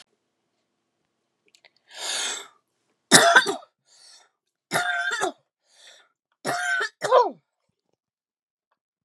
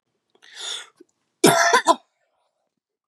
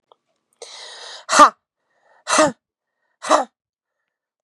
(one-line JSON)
{"three_cough_length": "9.0 s", "three_cough_amplitude": 32767, "three_cough_signal_mean_std_ratio": 0.32, "cough_length": "3.1 s", "cough_amplitude": 28793, "cough_signal_mean_std_ratio": 0.33, "exhalation_length": "4.4 s", "exhalation_amplitude": 32768, "exhalation_signal_mean_std_ratio": 0.27, "survey_phase": "beta (2021-08-13 to 2022-03-07)", "age": "18-44", "gender": "Female", "wearing_mask": "No", "symptom_cough_any": true, "symptom_new_continuous_cough": true, "symptom_runny_or_blocked_nose": true, "symptom_shortness_of_breath": true, "symptom_diarrhoea": true, "symptom_onset": "2 days", "smoker_status": "Never smoked", "respiratory_condition_asthma": true, "respiratory_condition_other": false, "recruitment_source": "Test and Trace", "submission_delay": "0 days", "covid_test_result": "Positive", "covid_test_method": "RT-qPCR", "covid_ct_value": 19.0, "covid_ct_gene": "ORF1ab gene", "covid_ct_mean": 19.4, "covid_viral_load": "440000 copies/ml", "covid_viral_load_category": "Low viral load (10K-1M copies/ml)"}